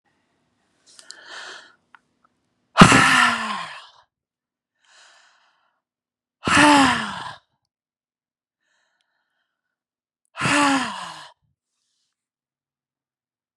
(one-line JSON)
{"exhalation_length": "13.6 s", "exhalation_amplitude": 32768, "exhalation_signal_mean_std_ratio": 0.29, "survey_phase": "beta (2021-08-13 to 2022-03-07)", "age": "45-64", "gender": "Female", "wearing_mask": "No", "symptom_fatigue": true, "symptom_change_to_sense_of_smell_or_taste": true, "symptom_onset": "12 days", "smoker_status": "Never smoked", "respiratory_condition_asthma": false, "respiratory_condition_other": false, "recruitment_source": "REACT", "submission_delay": "2 days", "covid_test_result": "Negative", "covid_test_method": "RT-qPCR", "influenza_a_test_result": "Negative", "influenza_b_test_result": "Negative"}